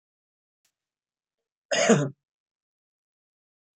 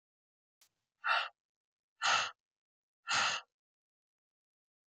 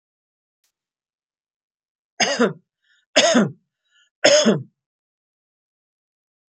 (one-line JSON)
{"cough_length": "3.8 s", "cough_amplitude": 18593, "cough_signal_mean_std_ratio": 0.24, "exhalation_length": "4.9 s", "exhalation_amplitude": 4199, "exhalation_signal_mean_std_ratio": 0.33, "three_cough_length": "6.5 s", "three_cough_amplitude": 28079, "three_cough_signal_mean_std_ratio": 0.3, "survey_phase": "beta (2021-08-13 to 2022-03-07)", "age": "45-64", "gender": "Female", "wearing_mask": "No", "symptom_none": true, "symptom_onset": "3 days", "smoker_status": "Ex-smoker", "respiratory_condition_asthma": false, "respiratory_condition_other": false, "recruitment_source": "REACT", "submission_delay": "2 days", "covid_test_result": "Negative", "covid_test_method": "RT-qPCR", "influenza_a_test_result": "Negative", "influenza_b_test_result": "Negative"}